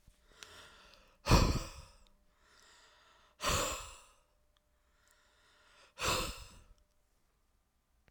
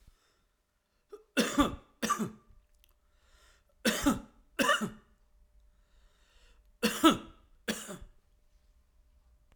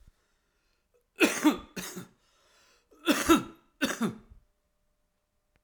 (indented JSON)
{
  "exhalation_length": "8.1 s",
  "exhalation_amplitude": 7164,
  "exhalation_signal_mean_std_ratio": 0.3,
  "three_cough_length": "9.6 s",
  "three_cough_amplitude": 12067,
  "three_cough_signal_mean_std_ratio": 0.32,
  "cough_length": "5.6 s",
  "cough_amplitude": 12583,
  "cough_signal_mean_std_ratio": 0.32,
  "survey_phase": "alpha (2021-03-01 to 2021-08-12)",
  "age": "45-64",
  "gender": "Male",
  "wearing_mask": "No",
  "symptom_shortness_of_breath": true,
  "symptom_diarrhoea": true,
  "symptom_fatigue": true,
  "symptom_change_to_sense_of_smell_or_taste": true,
  "symptom_onset": "5 days",
  "smoker_status": "Never smoked",
  "respiratory_condition_asthma": false,
  "respiratory_condition_other": false,
  "recruitment_source": "Test and Trace",
  "submission_delay": "2 days",
  "covid_test_result": "Positive",
  "covid_test_method": "RT-qPCR"
}